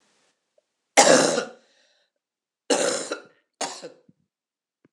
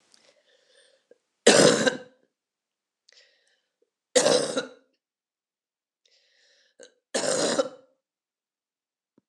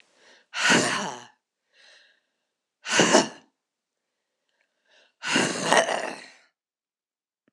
{"cough_length": "4.9 s", "cough_amplitude": 26028, "cough_signal_mean_std_ratio": 0.32, "three_cough_length": "9.3 s", "three_cough_amplitude": 24289, "three_cough_signal_mean_std_ratio": 0.28, "exhalation_length": "7.5 s", "exhalation_amplitude": 26020, "exhalation_signal_mean_std_ratio": 0.36, "survey_phase": "beta (2021-08-13 to 2022-03-07)", "age": "45-64", "gender": "Female", "wearing_mask": "No", "symptom_cough_any": true, "symptom_runny_or_blocked_nose": true, "symptom_shortness_of_breath": true, "symptom_sore_throat": true, "symptom_fatigue": true, "symptom_headache": true, "symptom_change_to_sense_of_smell_or_taste": true, "symptom_loss_of_taste": true, "symptom_onset": "4 days", "smoker_status": "Never smoked", "respiratory_condition_asthma": false, "respiratory_condition_other": false, "recruitment_source": "Test and Trace", "submission_delay": "2 days", "covid_test_result": "Positive", "covid_test_method": "RT-qPCR", "covid_ct_value": 13.3, "covid_ct_gene": "ORF1ab gene"}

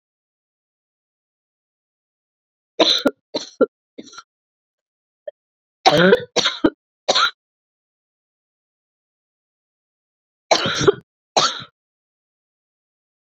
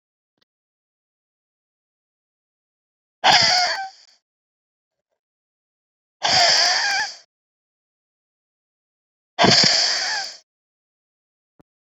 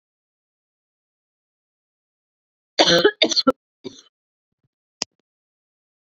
{"three_cough_length": "13.4 s", "three_cough_amplitude": 30135, "three_cough_signal_mean_std_ratio": 0.26, "exhalation_length": "11.9 s", "exhalation_amplitude": 28850, "exhalation_signal_mean_std_ratio": 0.35, "cough_length": "6.1 s", "cough_amplitude": 29859, "cough_signal_mean_std_ratio": 0.22, "survey_phase": "beta (2021-08-13 to 2022-03-07)", "age": "18-44", "gender": "Female", "wearing_mask": "No", "symptom_cough_any": true, "symptom_runny_or_blocked_nose": true, "symptom_shortness_of_breath": true, "symptom_abdominal_pain": true, "symptom_fatigue": true, "symptom_headache": true, "symptom_change_to_sense_of_smell_or_taste": true, "symptom_onset": "3 days", "smoker_status": "Never smoked", "respiratory_condition_asthma": false, "respiratory_condition_other": false, "recruitment_source": "Test and Trace", "submission_delay": "2 days", "covid_test_result": "Positive", "covid_test_method": "RT-qPCR", "covid_ct_value": 15.4, "covid_ct_gene": "N gene", "covid_ct_mean": 15.7, "covid_viral_load": "7200000 copies/ml", "covid_viral_load_category": "High viral load (>1M copies/ml)"}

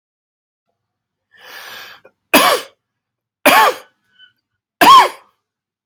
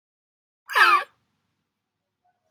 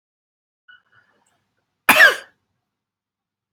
{"three_cough_length": "5.9 s", "three_cough_amplitude": 32768, "three_cough_signal_mean_std_ratio": 0.32, "exhalation_length": "2.5 s", "exhalation_amplitude": 23021, "exhalation_signal_mean_std_ratio": 0.27, "cough_length": "3.5 s", "cough_amplitude": 32767, "cough_signal_mean_std_ratio": 0.21, "survey_phase": "beta (2021-08-13 to 2022-03-07)", "age": "45-64", "gender": "Male", "wearing_mask": "No", "symptom_none": true, "smoker_status": "Never smoked", "respiratory_condition_asthma": true, "respiratory_condition_other": false, "recruitment_source": "Test and Trace", "submission_delay": "0 days", "covid_test_result": "Negative", "covid_test_method": "LFT"}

